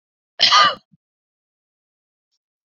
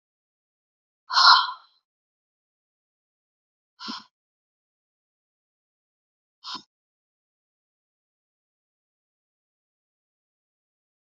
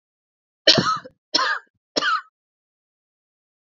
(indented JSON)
{
  "cough_length": "2.6 s",
  "cough_amplitude": 31699,
  "cough_signal_mean_std_ratio": 0.27,
  "exhalation_length": "11.1 s",
  "exhalation_amplitude": 27936,
  "exhalation_signal_mean_std_ratio": 0.15,
  "three_cough_length": "3.7 s",
  "three_cough_amplitude": 31115,
  "three_cough_signal_mean_std_ratio": 0.34,
  "survey_phase": "beta (2021-08-13 to 2022-03-07)",
  "age": "18-44",
  "gender": "Female",
  "wearing_mask": "No",
  "symptom_cough_any": true,
  "symptom_runny_or_blocked_nose": true,
  "symptom_shortness_of_breath": true,
  "symptom_fatigue": true,
  "symptom_change_to_sense_of_smell_or_taste": true,
  "symptom_onset": "5 days",
  "smoker_status": "Never smoked",
  "respiratory_condition_asthma": false,
  "respiratory_condition_other": false,
  "recruitment_source": "Test and Trace",
  "submission_delay": "2 days",
  "covid_test_result": "Positive",
  "covid_test_method": "RT-qPCR",
  "covid_ct_value": 21.5,
  "covid_ct_gene": "ORF1ab gene",
  "covid_ct_mean": 22.4,
  "covid_viral_load": "45000 copies/ml",
  "covid_viral_load_category": "Low viral load (10K-1M copies/ml)"
}